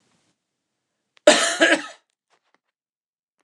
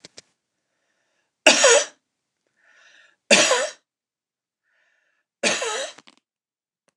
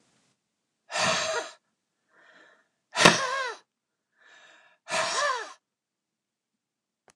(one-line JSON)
{"cough_length": "3.4 s", "cough_amplitude": 29204, "cough_signal_mean_std_ratio": 0.27, "three_cough_length": "7.0 s", "three_cough_amplitude": 29204, "three_cough_signal_mean_std_ratio": 0.3, "exhalation_length": "7.2 s", "exhalation_amplitude": 29203, "exhalation_signal_mean_std_ratio": 0.33, "survey_phase": "beta (2021-08-13 to 2022-03-07)", "age": "45-64", "gender": "Male", "wearing_mask": "No", "symptom_none": true, "smoker_status": "Ex-smoker", "respiratory_condition_asthma": false, "respiratory_condition_other": false, "recruitment_source": "REACT", "submission_delay": "2 days", "covid_test_result": "Negative", "covid_test_method": "RT-qPCR", "influenza_a_test_result": "Negative", "influenza_b_test_result": "Negative"}